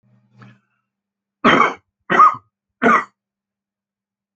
{"three_cough_length": "4.4 s", "three_cough_amplitude": 28615, "three_cough_signal_mean_std_ratio": 0.32, "survey_phase": "alpha (2021-03-01 to 2021-08-12)", "age": "65+", "gender": "Male", "wearing_mask": "No", "symptom_none": true, "smoker_status": "Current smoker (11 or more cigarettes per day)", "respiratory_condition_asthma": false, "respiratory_condition_other": false, "recruitment_source": "REACT", "submission_delay": "1 day", "covid_test_result": "Negative", "covid_test_method": "RT-qPCR"}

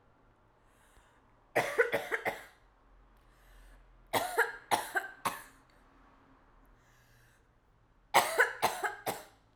{"three_cough_length": "9.6 s", "three_cough_amplitude": 10796, "three_cough_signal_mean_std_ratio": 0.36, "survey_phase": "alpha (2021-03-01 to 2021-08-12)", "age": "18-44", "gender": "Female", "wearing_mask": "No", "symptom_cough_any": true, "symptom_abdominal_pain": true, "symptom_fatigue": true, "symptom_fever_high_temperature": true, "symptom_headache": true, "smoker_status": "Never smoked", "respiratory_condition_asthma": false, "respiratory_condition_other": false, "recruitment_source": "Test and Trace", "submission_delay": "2 days", "covid_test_result": "Positive", "covid_test_method": "RT-qPCR", "covid_ct_value": 23.8, "covid_ct_gene": "ORF1ab gene", "covid_ct_mean": 24.4, "covid_viral_load": "9800 copies/ml", "covid_viral_load_category": "Minimal viral load (< 10K copies/ml)"}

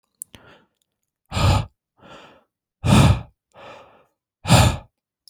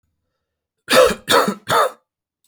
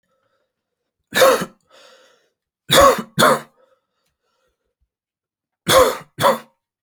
{"exhalation_length": "5.3 s", "exhalation_amplitude": 29063, "exhalation_signal_mean_std_ratio": 0.35, "cough_length": "2.5 s", "cough_amplitude": 29875, "cough_signal_mean_std_ratio": 0.43, "three_cough_length": "6.8 s", "three_cough_amplitude": 32767, "three_cough_signal_mean_std_ratio": 0.34, "survey_phase": "alpha (2021-03-01 to 2021-08-12)", "age": "18-44", "gender": "Male", "wearing_mask": "No", "symptom_cough_any": true, "symptom_headache": true, "smoker_status": "Never smoked", "respiratory_condition_asthma": false, "respiratory_condition_other": false, "recruitment_source": "REACT", "submission_delay": "2 days", "covid_test_result": "Negative", "covid_test_method": "RT-qPCR"}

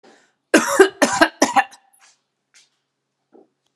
{"cough_length": "3.8 s", "cough_amplitude": 32767, "cough_signal_mean_std_ratio": 0.32, "survey_phase": "beta (2021-08-13 to 2022-03-07)", "age": "18-44", "gender": "Female", "wearing_mask": "No", "symptom_none": true, "smoker_status": "Ex-smoker", "respiratory_condition_asthma": false, "respiratory_condition_other": false, "recruitment_source": "Test and Trace", "submission_delay": "2 days", "covid_test_result": "Positive", "covid_test_method": "RT-qPCR", "covid_ct_value": 30.7, "covid_ct_gene": "N gene"}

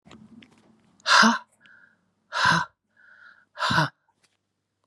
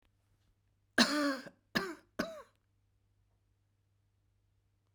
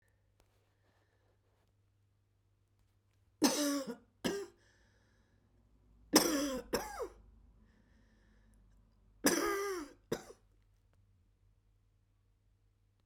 {"exhalation_length": "4.9 s", "exhalation_amplitude": 21576, "exhalation_signal_mean_std_ratio": 0.34, "cough_length": "4.9 s", "cough_amplitude": 7947, "cough_signal_mean_std_ratio": 0.28, "three_cough_length": "13.1 s", "three_cough_amplitude": 13817, "three_cough_signal_mean_std_ratio": 0.31, "survey_phase": "beta (2021-08-13 to 2022-03-07)", "age": "65+", "gender": "Female", "wearing_mask": "No", "symptom_cough_any": true, "symptom_runny_or_blocked_nose": true, "symptom_fatigue": true, "symptom_headache": true, "symptom_onset": "3 days", "smoker_status": "Ex-smoker", "respiratory_condition_asthma": false, "respiratory_condition_other": false, "recruitment_source": "Test and Trace", "submission_delay": "3 days", "covid_test_result": "Positive", "covid_test_method": "RT-qPCR", "covid_ct_value": 20.3, "covid_ct_gene": "ORF1ab gene", "covid_ct_mean": 20.4, "covid_viral_load": "210000 copies/ml", "covid_viral_load_category": "Low viral load (10K-1M copies/ml)"}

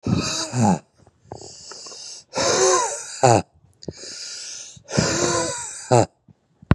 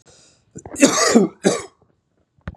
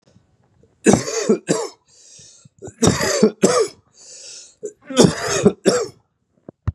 {"exhalation_length": "6.7 s", "exhalation_amplitude": 31988, "exhalation_signal_mean_std_ratio": 0.52, "cough_length": "2.6 s", "cough_amplitude": 32766, "cough_signal_mean_std_ratio": 0.39, "three_cough_length": "6.7 s", "three_cough_amplitude": 32768, "three_cough_signal_mean_std_ratio": 0.43, "survey_phase": "beta (2021-08-13 to 2022-03-07)", "age": "45-64", "gender": "Male", "wearing_mask": "No", "symptom_runny_or_blocked_nose": true, "smoker_status": "Ex-smoker", "respiratory_condition_asthma": false, "respiratory_condition_other": false, "recruitment_source": "Test and Trace", "submission_delay": "2 days", "covid_test_result": "Positive", "covid_test_method": "RT-qPCR", "covid_ct_value": 18.7, "covid_ct_gene": "ORF1ab gene", "covid_ct_mean": 19.1, "covid_viral_load": "530000 copies/ml", "covid_viral_load_category": "Low viral load (10K-1M copies/ml)"}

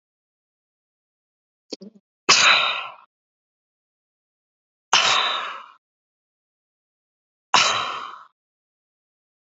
{"exhalation_length": "9.6 s", "exhalation_amplitude": 28557, "exhalation_signal_mean_std_ratio": 0.3, "survey_phase": "alpha (2021-03-01 to 2021-08-12)", "age": "45-64", "gender": "Female", "wearing_mask": "No", "symptom_none": true, "smoker_status": "Ex-smoker", "respiratory_condition_asthma": false, "respiratory_condition_other": false, "recruitment_source": "REACT", "submission_delay": "1 day", "covid_test_result": "Negative", "covid_test_method": "RT-qPCR"}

